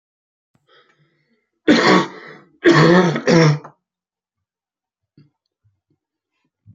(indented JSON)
{
  "cough_length": "6.7 s",
  "cough_amplitude": 29088,
  "cough_signal_mean_std_ratio": 0.35,
  "survey_phase": "beta (2021-08-13 to 2022-03-07)",
  "age": "45-64",
  "gender": "Male",
  "wearing_mask": "No",
  "symptom_cough_any": true,
  "symptom_runny_or_blocked_nose": true,
  "symptom_shortness_of_breath": true,
  "symptom_sore_throat": true,
  "symptom_abdominal_pain": true,
  "symptom_diarrhoea": true,
  "symptom_fatigue": true,
  "symptom_fever_high_temperature": true,
  "symptom_headache": true,
  "symptom_onset": "12 days",
  "smoker_status": "Current smoker (1 to 10 cigarettes per day)",
  "respiratory_condition_asthma": true,
  "respiratory_condition_other": true,
  "recruitment_source": "REACT",
  "submission_delay": "2 days",
  "covid_test_result": "Negative",
  "covid_test_method": "RT-qPCR",
  "influenza_a_test_result": "Negative",
  "influenza_b_test_result": "Negative"
}